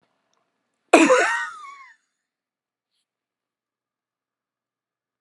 {"three_cough_length": "5.2 s", "three_cough_amplitude": 31940, "three_cough_signal_mean_std_ratio": 0.24, "survey_phase": "alpha (2021-03-01 to 2021-08-12)", "age": "65+", "gender": "Female", "wearing_mask": "No", "symptom_none": true, "smoker_status": "Never smoked", "respiratory_condition_asthma": false, "respiratory_condition_other": false, "recruitment_source": "REACT", "submission_delay": "1 day", "covid_test_result": "Negative", "covid_test_method": "RT-qPCR"}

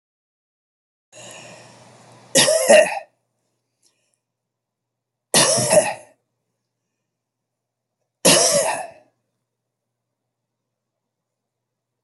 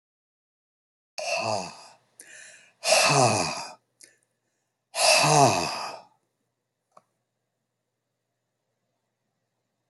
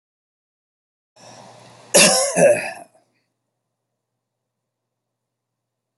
{"three_cough_length": "12.0 s", "three_cough_amplitude": 31590, "three_cough_signal_mean_std_ratio": 0.3, "exhalation_length": "9.9 s", "exhalation_amplitude": 18251, "exhalation_signal_mean_std_ratio": 0.36, "cough_length": "6.0 s", "cough_amplitude": 31144, "cough_signal_mean_std_ratio": 0.27, "survey_phase": "alpha (2021-03-01 to 2021-08-12)", "age": "65+", "gender": "Male", "wearing_mask": "No", "symptom_none": true, "smoker_status": "Never smoked", "respiratory_condition_asthma": false, "respiratory_condition_other": false, "recruitment_source": "REACT", "submission_delay": "2 days", "covid_test_result": "Negative", "covid_test_method": "RT-qPCR"}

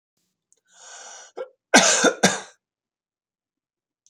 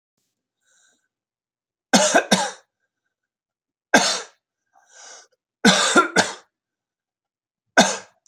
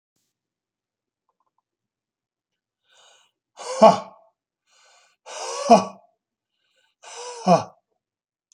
{"cough_length": "4.1 s", "cough_amplitude": 29850, "cough_signal_mean_std_ratio": 0.29, "three_cough_length": "8.3 s", "three_cough_amplitude": 31849, "three_cough_signal_mean_std_ratio": 0.32, "exhalation_length": "8.5 s", "exhalation_amplitude": 28102, "exhalation_signal_mean_std_ratio": 0.21, "survey_phase": "beta (2021-08-13 to 2022-03-07)", "age": "65+", "gender": "Male", "wearing_mask": "No", "symptom_none": true, "smoker_status": "Ex-smoker", "respiratory_condition_asthma": false, "respiratory_condition_other": false, "recruitment_source": "REACT", "submission_delay": "1 day", "covid_test_result": "Negative", "covid_test_method": "RT-qPCR"}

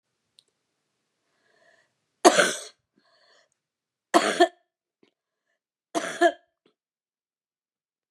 {"three_cough_length": "8.1 s", "three_cough_amplitude": 30642, "three_cough_signal_mean_std_ratio": 0.22, "survey_phase": "beta (2021-08-13 to 2022-03-07)", "age": "65+", "gender": "Female", "wearing_mask": "No", "symptom_cough_any": true, "symptom_sore_throat": true, "symptom_fatigue": true, "symptom_headache": true, "symptom_onset": "8 days", "smoker_status": "Never smoked", "respiratory_condition_asthma": false, "respiratory_condition_other": false, "recruitment_source": "Test and Trace", "submission_delay": "3 days", "covid_test_result": "Negative", "covid_test_method": "ePCR"}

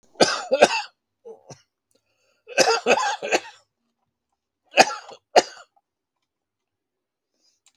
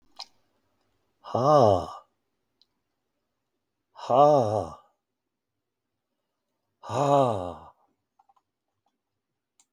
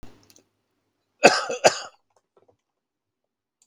{"three_cough_length": "7.8 s", "three_cough_amplitude": 32768, "three_cough_signal_mean_std_ratio": 0.3, "exhalation_length": "9.7 s", "exhalation_amplitude": 14688, "exhalation_signal_mean_std_ratio": 0.31, "cough_length": "3.7 s", "cough_amplitude": 32768, "cough_signal_mean_std_ratio": 0.22, "survey_phase": "beta (2021-08-13 to 2022-03-07)", "age": "65+", "gender": "Male", "wearing_mask": "No", "symptom_cough_any": true, "smoker_status": "Never smoked", "respiratory_condition_asthma": false, "respiratory_condition_other": true, "recruitment_source": "REACT", "submission_delay": "1 day", "covid_test_result": "Negative", "covid_test_method": "RT-qPCR", "influenza_a_test_result": "Negative", "influenza_b_test_result": "Negative"}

